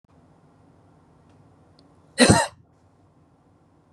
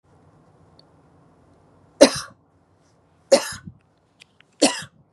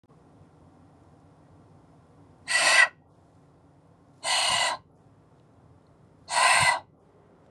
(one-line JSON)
{"cough_length": "3.9 s", "cough_amplitude": 26058, "cough_signal_mean_std_ratio": 0.22, "three_cough_length": "5.1 s", "three_cough_amplitude": 32768, "three_cough_signal_mean_std_ratio": 0.21, "exhalation_length": "7.5 s", "exhalation_amplitude": 16081, "exhalation_signal_mean_std_ratio": 0.37, "survey_phase": "beta (2021-08-13 to 2022-03-07)", "age": "45-64", "gender": "Female", "wearing_mask": "No", "symptom_none": true, "smoker_status": "Ex-smoker", "respiratory_condition_asthma": false, "respiratory_condition_other": false, "recruitment_source": "REACT", "submission_delay": "2 days", "covid_test_result": "Negative", "covid_test_method": "RT-qPCR", "influenza_a_test_result": "Unknown/Void", "influenza_b_test_result": "Unknown/Void"}